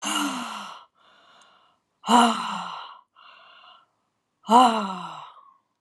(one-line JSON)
{"exhalation_length": "5.8 s", "exhalation_amplitude": 26632, "exhalation_signal_mean_std_ratio": 0.37, "survey_phase": "alpha (2021-03-01 to 2021-08-12)", "age": "45-64", "gender": "Female", "wearing_mask": "No", "symptom_none": true, "smoker_status": "Never smoked", "respiratory_condition_asthma": false, "respiratory_condition_other": true, "recruitment_source": "REACT", "submission_delay": "1 day", "covid_test_result": "Negative", "covid_test_method": "RT-qPCR"}